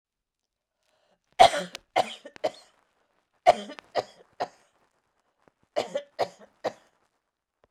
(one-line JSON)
{"three_cough_length": "7.7 s", "three_cough_amplitude": 21505, "three_cough_signal_mean_std_ratio": 0.22, "survey_phase": "beta (2021-08-13 to 2022-03-07)", "age": "45-64", "gender": "Female", "wearing_mask": "No", "symptom_none": true, "smoker_status": "Never smoked", "respiratory_condition_asthma": false, "respiratory_condition_other": false, "recruitment_source": "REACT", "submission_delay": "2 days", "covid_test_result": "Negative", "covid_test_method": "RT-qPCR", "influenza_a_test_result": "Negative", "influenza_b_test_result": "Negative"}